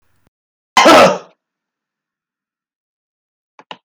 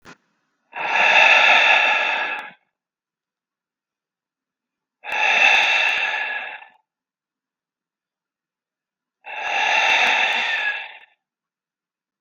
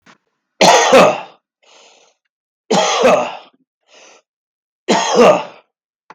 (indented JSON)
{
  "cough_length": "3.8 s",
  "cough_amplitude": 32768,
  "cough_signal_mean_std_ratio": 0.28,
  "exhalation_length": "12.2 s",
  "exhalation_amplitude": 31872,
  "exhalation_signal_mean_std_ratio": 0.5,
  "three_cough_length": "6.1 s",
  "three_cough_amplitude": 32768,
  "three_cough_signal_mean_std_ratio": 0.44,
  "survey_phase": "beta (2021-08-13 to 2022-03-07)",
  "age": "45-64",
  "gender": "Male",
  "wearing_mask": "No",
  "symptom_none": true,
  "smoker_status": "Current smoker (1 to 10 cigarettes per day)",
  "respiratory_condition_asthma": false,
  "respiratory_condition_other": false,
  "recruitment_source": "REACT",
  "submission_delay": "3 days",
  "covid_test_result": "Negative",
  "covid_test_method": "RT-qPCR",
  "influenza_a_test_result": "Unknown/Void",
  "influenza_b_test_result": "Unknown/Void"
}